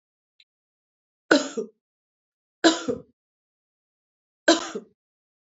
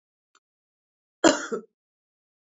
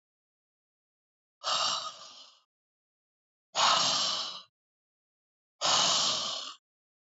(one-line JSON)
{"three_cough_length": "5.5 s", "three_cough_amplitude": 27109, "three_cough_signal_mean_std_ratio": 0.24, "cough_length": "2.5 s", "cough_amplitude": 22272, "cough_signal_mean_std_ratio": 0.21, "exhalation_length": "7.2 s", "exhalation_amplitude": 7949, "exhalation_signal_mean_std_ratio": 0.44, "survey_phase": "beta (2021-08-13 to 2022-03-07)", "age": "65+", "gender": "Female", "wearing_mask": "No", "symptom_none": true, "smoker_status": "Never smoked", "respiratory_condition_asthma": false, "respiratory_condition_other": false, "recruitment_source": "REACT", "submission_delay": "3 days", "covid_test_result": "Negative", "covid_test_method": "RT-qPCR", "influenza_a_test_result": "Unknown/Void", "influenza_b_test_result": "Unknown/Void"}